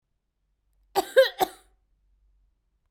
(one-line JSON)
{"cough_length": "2.9 s", "cough_amplitude": 15493, "cough_signal_mean_std_ratio": 0.23, "survey_phase": "beta (2021-08-13 to 2022-03-07)", "age": "18-44", "gender": "Female", "wearing_mask": "No", "symptom_new_continuous_cough": true, "symptom_runny_or_blocked_nose": true, "symptom_fatigue": true, "symptom_headache": true, "symptom_onset": "5 days", "smoker_status": "Never smoked", "respiratory_condition_asthma": false, "respiratory_condition_other": false, "recruitment_source": "Test and Trace", "submission_delay": "1 day", "covid_test_result": "Negative", "covid_test_method": "RT-qPCR"}